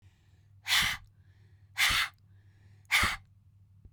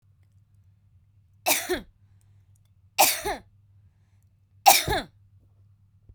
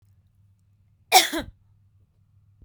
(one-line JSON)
{"exhalation_length": "3.9 s", "exhalation_amplitude": 7892, "exhalation_signal_mean_std_ratio": 0.41, "three_cough_length": "6.1 s", "three_cough_amplitude": 26649, "three_cough_signal_mean_std_ratio": 0.28, "cough_length": "2.6 s", "cough_amplitude": 31011, "cough_signal_mean_std_ratio": 0.22, "survey_phase": "beta (2021-08-13 to 2022-03-07)", "age": "18-44", "gender": "Female", "wearing_mask": "No", "symptom_none": true, "smoker_status": "Never smoked", "respiratory_condition_asthma": false, "respiratory_condition_other": false, "recruitment_source": "REACT", "submission_delay": "4 days", "covid_test_result": "Negative", "covid_test_method": "RT-qPCR"}